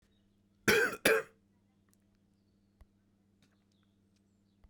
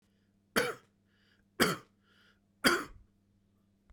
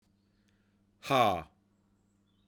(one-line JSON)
{"cough_length": "4.7 s", "cough_amplitude": 10002, "cough_signal_mean_std_ratio": 0.25, "three_cough_length": "3.9 s", "three_cough_amplitude": 11490, "three_cough_signal_mean_std_ratio": 0.29, "exhalation_length": "2.5 s", "exhalation_amplitude": 6802, "exhalation_signal_mean_std_ratio": 0.29, "survey_phase": "beta (2021-08-13 to 2022-03-07)", "age": "45-64", "gender": "Male", "wearing_mask": "No", "symptom_cough_any": true, "symptom_fatigue": true, "symptom_headache": true, "symptom_loss_of_taste": true, "symptom_onset": "3 days", "smoker_status": "Never smoked", "respiratory_condition_asthma": false, "respiratory_condition_other": false, "recruitment_source": "Test and Trace", "submission_delay": "2 days", "covid_test_result": "Positive", "covid_test_method": "RT-qPCR", "covid_ct_value": 15.4, "covid_ct_gene": "ORF1ab gene", "covid_ct_mean": 16.5, "covid_viral_load": "3700000 copies/ml", "covid_viral_load_category": "High viral load (>1M copies/ml)"}